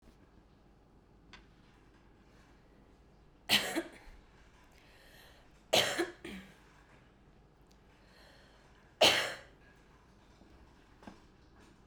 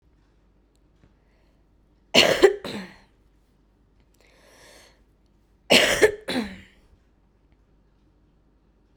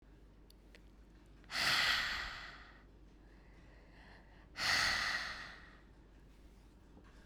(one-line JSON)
{"three_cough_length": "11.9 s", "three_cough_amplitude": 8645, "three_cough_signal_mean_std_ratio": 0.27, "cough_length": "9.0 s", "cough_amplitude": 32767, "cough_signal_mean_std_ratio": 0.26, "exhalation_length": "7.3 s", "exhalation_amplitude": 2879, "exhalation_signal_mean_std_ratio": 0.49, "survey_phase": "beta (2021-08-13 to 2022-03-07)", "age": "18-44", "gender": "Female", "wearing_mask": "No", "symptom_cough_any": true, "symptom_runny_or_blocked_nose": true, "symptom_shortness_of_breath": true, "symptom_diarrhoea": true, "symptom_fatigue": true, "symptom_headache": true, "symptom_change_to_sense_of_smell_or_taste": true, "symptom_loss_of_taste": true, "symptom_onset": "4 days", "smoker_status": "Current smoker (1 to 10 cigarettes per day)", "respiratory_condition_asthma": false, "respiratory_condition_other": false, "recruitment_source": "Test and Trace", "submission_delay": "2 days", "covid_test_result": "Positive", "covid_test_method": "RT-qPCR", "covid_ct_value": 19.9, "covid_ct_gene": "ORF1ab gene", "covid_ct_mean": 20.4, "covid_viral_load": "200000 copies/ml", "covid_viral_load_category": "Low viral load (10K-1M copies/ml)"}